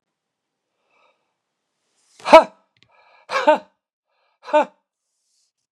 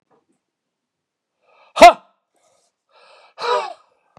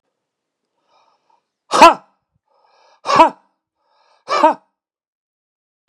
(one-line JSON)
{"three_cough_length": "5.7 s", "three_cough_amplitude": 32768, "three_cough_signal_mean_std_ratio": 0.2, "cough_length": "4.2 s", "cough_amplitude": 32768, "cough_signal_mean_std_ratio": 0.19, "exhalation_length": "5.9 s", "exhalation_amplitude": 32768, "exhalation_signal_mean_std_ratio": 0.24, "survey_phase": "beta (2021-08-13 to 2022-03-07)", "age": "65+", "gender": "Male", "wearing_mask": "No", "symptom_none": true, "smoker_status": "Current smoker (e-cigarettes or vapes only)", "respiratory_condition_asthma": false, "respiratory_condition_other": false, "recruitment_source": "Test and Trace", "submission_delay": "2 days", "covid_test_result": "Positive", "covid_test_method": "RT-qPCR", "covid_ct_value": 33.0, "covid_ct_gene": "ORF1ab gene", "covid_ct_mean": 34.7, "covid_viral_load": "4.1 copies/ml", "covid_viral_load_category": "Minimal viral load (< 10K copies/ml)"}